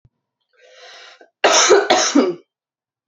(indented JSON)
{
  "cough_length": "3.1 s",
  "cough_amplitude": 32767,
  "cough_signal_mean_std_ratio": 0.44,
  "survey_phase": "beta (2021-08-13 to 2022-03-07)",
  "age": "18-44",
  "gender": "Female",
  "wearing_mask": "No",
  "symptom_runny_or_blocked_nose": true,
  "symptom_headache": true,
  "symptom_other": true,
  "smoker_status": "Never smoked",
  "respiratory_condition_asthma": true,
  "respiratory_condition_other": false,
  "recruitment_source": "Test and Trace",
  "submission_delay": "1 day",
  "covid_test_result": "Positive",
  "covid_test_method": "RT-qPCR",
  "covid_ct_value": 28.3,
  "covid_ct_gene": "ORF1ab gene",
  "covid_ct_mean": 28.9,
  "covid_viral_load": "340 copies/ml",
  "covid_viral_load_category": "Minimal viral load (< 10K copies/ml)"
}